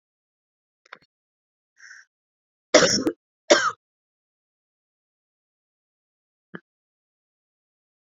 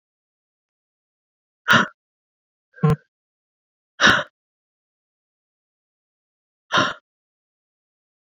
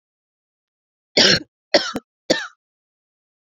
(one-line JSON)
{"cough_length": "8.2 s", "cough_amplitude": 29733, "cough_signal_mean_std_ratio": 0.19, "exhalation_length": "8.4 s", "exhalation_amplitude": 29257, "exhalation_signal_mean_std_ratio": 0.22, "three_cough_length": "3.6 s", "three_cough_amplitude": 31100, "three_cough_signal_mean_std_ratio": 0.28, "survey_phase": "beta (2021-08-13 to 2022-03-07)", "age": "18-44", "gender": "Female", "wearing_mask": "No", "symptom_cough_any": true, "symptom_runny_or_blocked_nose": true, "symptom_fatigue": true, "symptom_fever_high_temperature": true, "symptom_headache": true, "symptom_onset": "2 days", "smoker_status": "Never smoked", "respiratory_condition_asthma": false, "respiratory_condition_other": false, "recruitment_source": "Test and Trace", "submission_delay": "2 days", "covid_test_result": "Positive", "covid_test_method": "ePCR"}